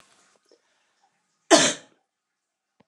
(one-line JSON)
{"cough_length": "2.9 s", "cough_amplitude": 28124, "cough_signal_mean_std_ratio": 0.21, "survey_phase": "beta (2021-08-13 to 2022-03-07)", "age": "45-64", "gender": "Female", "wearing_mask": "No", "symptom_cough_any": true, "symptom_runny_or_blocked_nose": true, "symptom_shortness_of_breath": true, "symptom_diarrhoea": true, "symptom_fatigue": true, "symptom_fever_high_temperature": true, "symptom_headache": true, "smoker_status": "Ex-smoker", "respiratory_condition_asthma": false, "respiratory_condition_other": false, "recruitment_source": "Test and Trace", "submission_delay": "3 days", "covid_test_result": "Positive", "covid_test_method": "LFT"}